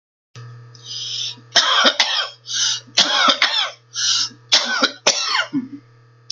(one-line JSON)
{"cough_length": "6.3 s", "cough_amplitude": 32768, "cough_signal_mean_std_ratio": 0.61, "survey_phase": "beta (2021-08-13 to 2022-03-07)", "age": "45-64", "gender": "Female", "wearing_mask": "No", "symptom_none": true, "symptom_onset": "10 days", "smoker_status": "Ex-smoker", "respiratory_condition_asthma": false, "respiratory_condition_other": false, "recruitment_source": "REACT", "submission_delay": "0 days", "covid_test_result": "Negative", "covid_test_method": "RT-qPCR", "influenza_a_test_result": "Negative", "influenza_b_test_result": "Negative"}